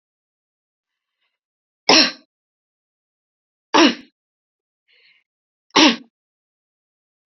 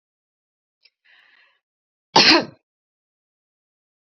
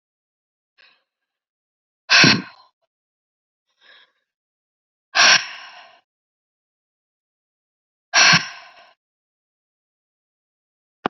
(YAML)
three_cough_length: 7.3 s
three_cough_amplitude: 31899
three_cough_signal_mean_std_ratio: 0.22
cough_length: 4.0 s
cough_amplitude: 32768
cough_signal_mean_std_ratio: 0.21
exhalation_length: 11.1 s
exhalation_amplitude: 29640
exhalation_signal_mean_std_ratio: 0.23
survey_phase: beta (2021-08-13 to 2022-03-07)
age: 45-64
gender: Female
wearing_mask: 'No'
symptom_runny_or_blocked_nose: true
smoker_status: Never smoked
respiratory_condition_asthma: false
respiratory_condition_other: false
recruitment_source: REACT
submission_delay: 2 days
covid_test_result: Negative
covid_test_method: RT-qPCR
influenza_a_test_result: Negative
influenza_b_test_result: Negative